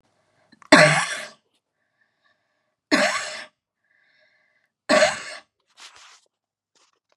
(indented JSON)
{
  "three_cough_length": "7.2 s",
  "three_cough_amplitude": 32768,
  "three_cough_signal_mean_std_ratio": 0.29,
  "survey_phase": "beta (2021-08-13 to 2022-03-07)",
  "age": "45-64",
  "gender": "Female",
  "wearing_mask": "No",
  "symptom_cough_any": true,
  "symptom_new_continuous_cough": true,
  "symptom_fatigue": true,
  "symptom_onset": "13 days",
  "smoker_status": "Never smoked",
  "respiratory_condition_asthma": false,
  "respiratory_condition_other": false,
  "recruitment_source": "REACT",
  "submission_delay": "1 day",
  "covid_test_result": "Negative",
  "covid_test_method": "RT-qPCR",
  "influenza_a_test_result": "Unknown/Void",
  "influenza_b_test_result": "Unknown/Void"
}